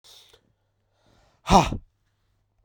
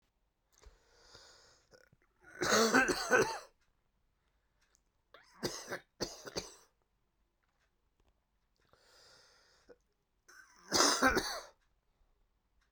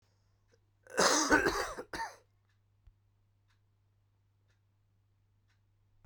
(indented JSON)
{
  "exhalation_length": "2.6 s",
  "exhalation_amplitude": 23835,
  "exhalation_signal_mean_std_ratio": 0.22,
  "three_cough_length": "12.7 s",
  "three_cough_amplitude": 8773,
  "three_cough_signal_mean_std_ratio": 0.3,
  "cough_length": "6.1 s",
  "cough_amplitude": 8277,
  "cough_signal_mean_std_ratio": 0.3,
  "survey_phase": "beta (2021-08-13 to 2022-03-07)",
  "age": "18-44",
  "gender": "Male",
  "wearing_mask": "No",
  "symptom_cough_any": true,
  "symptom_new_continuous_cough": true,
  "symptom_runny_or_blocked_nose": true,
  "symptom_abdominal_pain": true,
  "symptom_fatigue": true,
  "symptom_headache": true,
  "smoker_status": "Never smoked",
  "respiratory_condition_asthma": false,
  "respiratory_condition_other": false,
  "recruitment_source": "Test and Trace",
  "submission_delay": "2 days",
  "covid_test_result": "Positive",
  "covid_test_method": "ePCR"
}